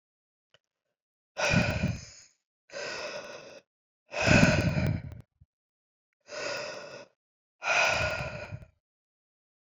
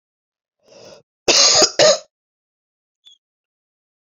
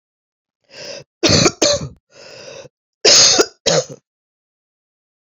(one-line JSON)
{"exhalation_length": "9.7 s", "exhalation_amplitude": 13977, "exhalation_signal_mean_std_ratio": 0.43, "cough_length": "4.0 s", "cough_amplitude": 32768, "cough_signal_mean_std_ratio": 0.32, "three_cough_length": "5.4 s", "three_cough_amplitude": 32050, "three_cough_signal_mean_std_ratio": 0.38, "survey_phase": "beta (2021-08-13 to 2022-03-07)", "age": "45-64", "gender": "Female", "wearing_mask": "No", "symptom_cough_any": true, "symptom_runny_or_blocked_nose": true, "symptom_shortness_of_breath": true, "symptom_fatigue": true, "symptom_headache": true, "symptom_change_to_sense_of_smell_or_taste": true, "symptom_loss_of_taste": true, "symptom_onset": "4 days", "smoker_status": "Never smoked", "respiratory_condition_asthma": false, "respiratory_condition_other": false, "recruitment_source": "Test and Trace", "submission_delay": "1 day", "covid_test_result": "Positive", "covid_test_method": "RT-qPCR", "covid_ct_value": 15.4, "covid_ct_gene": "ORF1ab gene", "covid_ct_mean": 15.5, "covid_viral_load": "8100000 copies/ml", "covid_viral_load_category": "High viral load (>1M copies/ml)"}